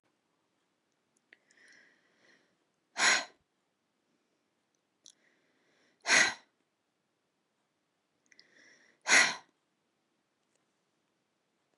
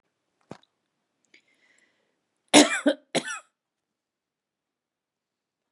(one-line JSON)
{"exhalation_length": "11.8 s", "exhalation_amplitude": 11302, "exhalation_signal_mean_std_ratio": 0.2, "cough_length": "5.7 s", "cough_amplitude": 27935, "cough_signal_mean_std_ratio": 0.19, "survey_phase": "beta (2021-08-13 to 2022-03-07)", "age": "45-64", "gender": "Female", "wearing_mask": "No", "symptom_none": true, "smoker_status": "Ex-smoker", "respiratory_condition_asthma": false, "respiratory_condition_other": false, "recruitment_source": "REACT", "submission_delay": "3 days", "covid_test_result": "Negative", "covid_test_method": "RT-qPCR", "influenza_a_test_result": "Negative", "influenza_b_test_result": "Negative"}